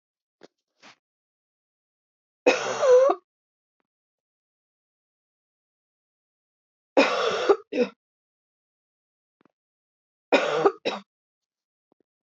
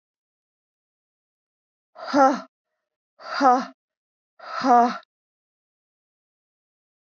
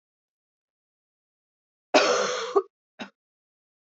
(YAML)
three_cough_length: 12.4 s
three_cough_amplitude: 17430
three_cough_signal_mean_std_ratio: 0.28
exhalation_length: 7.1 s
exhalation_amplitude: 21902
exhalation_signal_mean_std_ratio: 0.28
cough_length: 3.8 s
cough_amplitude: 19401
cough_signal_mean_std_ratio: 0.3
survey_phase: beta (2021-08-13 to 2022-03-07)
age: 18-44
gender: Female
wearing_mask: 'No'
symptom_cough_any: true
symptom_runny_or_blocked_nose: true
symptom_fatigue: true
symptom_fever_high_temperature: true
smoker_status: Never smoked
respiratory_condition_asthma: false
respiratory_condition_other: false
recruitment_source: Test and Trace
submission_delay: 2 days
covid_test_result: Positive
covid_test_method: RT-qPCR
covid_ct_value: 23.4
covid_ct_gene: N gene